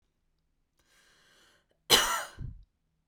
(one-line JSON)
{"cough_length": "3.1 s", "cough_amplitude": 15603, "cough_signal_mean_std_ratio": 0.26, "survey_phase": "beta (2021-08-13 to 2022-03-07)", "age": "18-44", "gender": "Female", "wearing_mask": "No", "symptom_none": true, "smoker_status": "Never smoked", "respiratory_condition_asthma": false, "respiratory_condition_other": false, "recruitment_source": "REACT", "submission_delay": "2 days", "covid_test_result": "Negative", "covid_test_method": "RT-qPCR"}